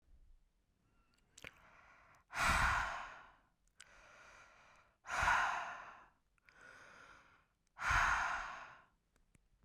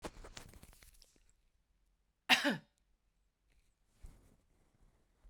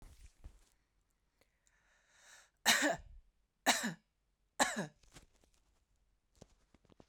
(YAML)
exhalation_length: 9.6 s
exhalation_amplitude: 3087
exhalation_signal_mean_std_ratio: 0.41
cough_length: 5.3 s
cough_amplitude: 7496
cough_signal_mean_std_ratio: 0.21
three_cough_length: 7.1 s
three_cough_amplitude: 7110
three_cough_signal_mean_std_ratio: 0.27
survey_phase: beta (2021-08-13 to 2022-03-07)
age: 18-44
gender: Female
wearing_mask: 'No'
symptom_none: true
smoker_status: Never smoked
respiratory_condition_asthma: true
respiratory_condition_other: false
recruitment_source: REACT
submission_delay: 4 days
covid_test_result: Negative
covid_test_method: RT-qPCR